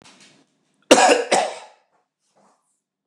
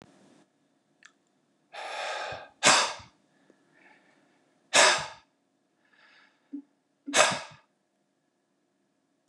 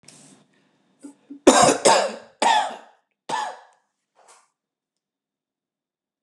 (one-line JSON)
{"cough_length": "3.1 s", "cough_amplitude": 29204, "cough_signal_mean_std_ratio": 0.32, "exhalation_length": "9.3 s", "exhalation_amplitude": 23908, "exhalation_signal_mean_std_ratio": 0.28, "three_cough_length": "6.2 s", "three_cough_amplitude": 29204, "three_cough_signal_mean_std_ratio": 0.31, "survey_phase": "beta (2021-08-13 to 2022-03-07)", "age": "45-64", "gender": "Male", "wearing_mask": "No", "symptom_none": true, "smoker_status": "Never smoked", "respiratory_condition_asthma": false, "respiratory_condition_other": false, "recruitment_source": "REACT", "submission_delay": "1 day", "covid_test_result": "Negative", "covid_test_method": "RT-qPCR", "influenza_a_test_result": "Negative", "influenza_b_test_result": "Negative"}